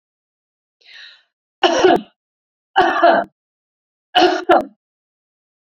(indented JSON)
{
  "three_cough_length": "5.6 s",
  "three_cough_amplitude": 32767,
  "three_cough_signal_mean_std_ratio": 0.38,
  "survey_phase": "beta (2021-08-13 to 2022-03-07)",
  "age": "45-64",
  "gender": "Female",
  "wearing_mask": "No",
  "symptom_runny_or_blocked_nose": true,
  "symptom_other": true,
  "smoker_status": "Never smoked",
  "respiratory_condition_asthma": false,
  "respiratory_condition_other": false,
  "recruitment_source": "Test and Trace",
  "submission_delay": "2 days",
  "covid_test_result": "Positive",
  "covid_test_method": "ePCR"
}